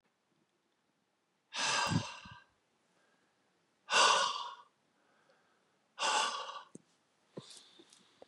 {"exhalation_length": "8.3 s", "exhalation_amplitude": 6294, "exhalation_signal_mean_std_ratio": 0.35, "survey_phase": "beta (2021-08-13 to 2022-03-07)", "age": "45-64", "gender": "Male", "wearing_mask": "No", "symptom_cough_any": true, "symptom_runny_or_blocked_nose": true, "symptom_sore_throat": true, "symptom_abdominal_pain": true, "symptom_fatigue": true, "symptom_onset": "3 days", "smoker_status": "Never smoked", "respiratory_condition_asthma": false, "respiratory_condition_other": false, "recruitment_source": "Test and Trace", "submission_delay": "2 days", "covid_test_result": "Positive", "covid_test_method": "RT-qPCR", "covid_ct_value": 19.3, "covid_ct_gene": "ORF1ab gene", "covid_ct_mean": 19.3, "covid_viral_load": "460000 copies/ml", "covid_viral_load_category": "Low viral load (10K-1M copies/ml)"}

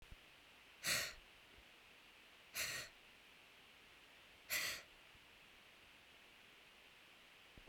{"exhalation_length": "7.7 s", "exhalation_amplitude": 1825, "exhalation_signal_mean_std_ratio": 0.44, "survey_phase": "beta (2021-08-13 to 2022-03-07)", "age": "45-64", "gender": "Female", "wearing_mask": "No", "symptom_cough_any": true, "symptom_runny_or_blocked_nose": true, "symptom_fatigue": true, "symptom_onset": "3 days", "smoker_status": "Never smoked", "respiratory_condition_asthma": false, "respiratory_condition_other": false, "recruitment_source": "Test and Trace", "submission_delay": "2 days", "covid_test_result": "Positive", "covid_test_method": "RT-qPCR", "covid_ct_value": 18.2, "covid_ct_gene": "ORF1ab gene", "covid_ct_mean": 19.5, "covid_viral_load": "410000 copies/ml", "covid_viral_load_category": "Low viral load (10K-1M copies/ml)"}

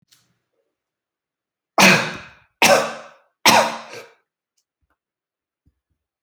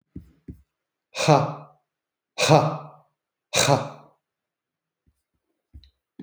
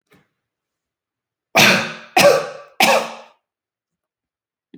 {"three_cough_length": "6.2 s", "three_cough_amplitude": 31837, "three_cough_signal_mean_std_ratio": 0.29, "exhalation_length": "6.2 s", "exhalation_amplitude": 27576, "exhalation_signal_mean_std_ratio": 0.3, "cough_length": "4.8 s", "cough_amplitude": 32767, "cough_signal_mean_std_ratio": 0.35, "survey_phase": "alpha (2021-03-01 to 2021-08-12)", "age": "45-64", "gender": "Male", "wearing_mask": "No", "symptom_none": true, "smoker_status": "Ex-smoker", "respiratory_condition_asthma": false, "respiratory_condition_other": false, "recruitment_source": "REACT", "submission_delay": "1 day", "covid_test_result": "Negative", "covid_test_method": "RT-qPCR"}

